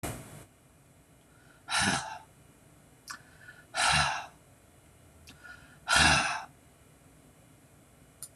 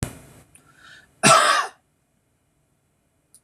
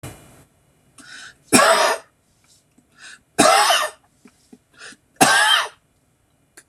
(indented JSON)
{
  "exhalation_length": "8.4 s",
  "exhalation_amplitude": 10647,
  "exhalation_signal_mean_std_ratio": 0.38,
  "cough_length": "3.4 s",
  "cough_amplitude": 26027,
  "cough_signal_mean_std_ratio": 0.3,
  "three_cough_length": "6.7 s",
  "three_cough_amplitude": 26028,
  "three_cough_signal_mean_std_ratio": 0.39,
  "survey_phase": "beta (2021-08-13 to 2022-03-07)",
  "age": "45-64",
  "gender": "Male",
  "wearing_mask": "No",
  "symptom_none": true,
  "smoker_status": "Never smoked",
  "respiratory_condition_asthma": false,
  "respiratory_condition_other": false,
  "recruitment_source": "REACT",
  "submission_delay": "2 days",
  "covid_test_result": "Negative",
  "covid_test_method": "RT-qPCR",
  "influenza_a_test_result": "Negative",
  "influenza_b_test_result": "Negative"
}